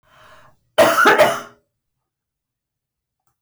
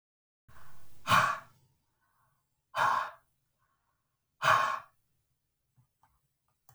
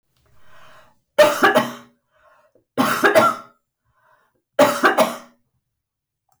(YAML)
cough_length: 3.4 s
cough_amplitude: 22149
cough_signal_mean_std_ratio: 0.35
exhalation_length: 6.7 s
exhalation_amplitude: 9370
exhalation_signal_mean_std_ratio: 0.34
three_cough_length: 6.4 s
three_cough_amplitude: 23139
three_cough_signal_mean_std_ratio: 0.39
survey_phase: alpha (2021-03-01 to 2021-08-12)
age: 45-64
gender: Female
wearing_mask: 'No'
symptom_none: true
smoker_status: Never smoked
respiratory_condition_asthma: false
respiratory_condition_other: false
recruitment_source: REACT
submission_delay: 1 day
covid_test_result: Negative
covid_test_method: RT-qPCR